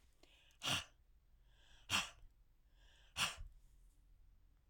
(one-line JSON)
{"exhalation_length": "4.7 s", "exhalation_amplitude": 2265, "exhalation_signal_mean_std_ratio": 0.35, "survey_phase": "alpha (2021-03-01 to 2021-08-12)", "age": "65+", "gender": "Female", "wearing_mask": "No", "symptom_none": true, "smoker_status": "Never smoked", "respiratory_condition_asthma": false, "respiratory_condition_other": false, "recruitment_source": "REACT", "submission_delay": "1 day", "covid_test_result": "Negative", "covid_test_method": "RT-qPCR"}